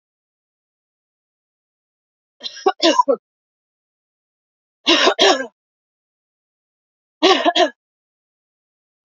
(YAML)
three_cough_length: 9.0 s
three_cough_amplitude: 30463
three_cough_signal_mean_std_ratio: 0.29
survey_phase: beta (2021-08-13 to 2022-03-07)
age: 45-64
gender: Female
wearing_mask: 'No'
symptom_cough_any: true
symptom_runny_or_blocked_nose: true
symptom_shortness_of_breath: true
symptom_sore_throat: true
symptom_abdominal_pain: true
symptom_fatigue: true
symptom_fever_high_temperature: true
symptom_headache: true
symptom_change_to_sense_of_smell_or_taste: true
symptom_other: true
smoker_status: Never smoked
respiratory_condition_asthma: false
respiratory_condition_other: false
recruitment_source: Test and Trace
submission_delay: 1 day
covid_test_result: Positive
covid_test_method: RT-qPCR
covid_ct_value: 26.7
covid_ct_gene: S gene
covid_ct_mean: 27.1
covid_viral_load: 1300 copies/ml
covid_viral_load_category: Minimal viral load (< 10K copies/ml)